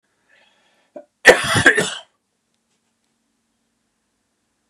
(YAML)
cough_length: 4.7 s
cough_amplitude: 32768
cough_signal_mean_std_ratio: 0.24
survey_phase: beta (2021-08-13 to 2022-03-07)
age: 45-64
gender: Male
wearing_mask: 'No'
symptom_cough_any: true
symptom_runny_or_blocked_nose: true
symptom_sore_throat: true
symptom_fatigue: true
smoker_status: Never smoked
respiratory_condition_asthma: false
respiratory_condition_other: false
recruitment_source: REACT
submission_delay: 2 days
covid_test_result: Negative
covid_test_method: RT-qPCR
influenza_a_test_result: Unknown/Void
influenza_b_test_result: Unknown/Void